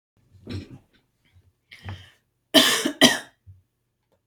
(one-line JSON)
{"cough_length": "4.3 s", "cough_amplitude": 30995, "cough_signal_mean_std_ratio": 0.28, "survey_phase": "beta (2021-08-13 to 2022-03-07)", "age": "45-64", "gender": "Female", "wearing_mask": "No", "symptom_none": true, "smoker_status": "Ex-smoker", "respiratory_condition_asthma": false, "respiratory_condition_other": false, "recruitment_source": "REACT", "submission_delay": "1 day", "covid_test_result": "Negative", "covid_test_method": "RT-qPCR"}